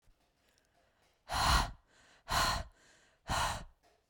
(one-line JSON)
{"exhalation_length": "4.1 s", "exhalation_amplitude": 4999, "exhalation_signal_mean_std_ratio": 0.43, "survey_phase": "beta (2021-08-13 to 2022-03-07)", "age": "18-44", "gender": "Female", "wearing_mask": "No", "symptom_runny_or_blocked_nose": true, "smoker_status": "Never smoked", "respiratory_condition_asthma": false, "respiratory_condition_other": false, "recruitment_source": "REACT", "submission_delay": "2 days", "covid_test_result": "Negative", "covid_test_method": "RT-qPCR", "influenza_a_test_result": "Unknown/Void", "influenza_b_test_result": "Unknown/Void"}